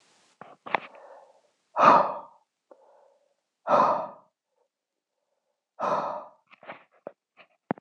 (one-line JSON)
{"exhalation_length": "7.8 s", "exhalation_amplitude": 22981, "exhalation_signal_mean_std_ratio": 0.29, "survey_phase": "beta (2021-08-13 to 2022-03-07)", "age": "18-44", "gender": "Male", "wearing_mask": "No", "symptom_cough_any": true, "symptom_runny_or_blocked_nose": true, "symptom_sore_throat": true, "symptom_fever_high_temperature": true, "symptom_headache": true, "symptom_onset": "3 days", "smoker_status": "Never smoked", "respiratory_condition_asthma": false, "respiratory_condition_other": false, "recruitment_source": "Test and Trace", "submission_delay": "1 day", "covid_test_result": "Positive", "covid_test_method": "RT-qPCR", "covid_ct_value": 16.9, "covid_ct_gene": "ORF1ab gene"}